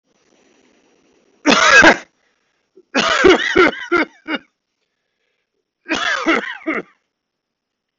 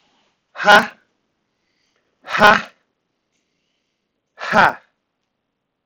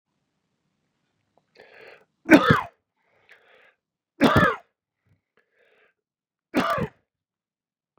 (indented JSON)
{
  "cough_length": "8.0 s",
  "cough_amplitude": 31365,
  "cough_signal_mean_std_ratio": 0.39,
  "exhalation_length": "5.9 s",
  "exhalation_amplitude": 28832,
  "exhalation_signal_mean_std_ratio": 0.26,
  "three_cough_length": "8.0 s",
  "three_cough_amplitude": 29358,
  "three_cough_signal_mean_std_ratio": 0.24,
  "survey_phase": "beta (2021-08-13 to 2022-03-07)",
  "age": "45-64",
  "gender": "Male",
  "wearing_mask": "No",
  "symptom_none": true,
  "smoker_status": "Ex-smoker",
  "respiratory_condition_asthma": false,
  "respiratory_condition_other": false,
  "recruitment_source": "REACT",
  "submission_delay": "2 days",
  "covid_test_result": "Negative",
  "covid_test_method": "RT-qPCR",
  "influenza_a_test_result": "Negative",
  "influenza_b_test_result": "Negative"
}